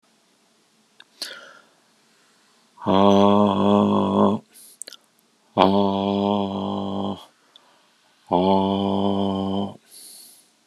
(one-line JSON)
{"exhalation_length": "10.7 s", "exhalation_amplitude": 32021, "exhalation_signal_mean_std_ratio": 0.52, "survey_phase": "beta (2021-08-13 to 2022-03-07)", "age": "45-64", "gender": "Male", "wearing_mask": "No", "symptom_cough_any": true, "smoker_status": "Never smoked", "respiratory_condition_asthma": false, "respiratory_condition_other": false, "recruitment_source": "Test and Trace", "submission_delay": "1 day", "covid_test_result": "Positive", "covid_test_method": "RT-qPCR", "covid_ct_value": 23.3, "covid_ct_gene": "ORF1ab gene"}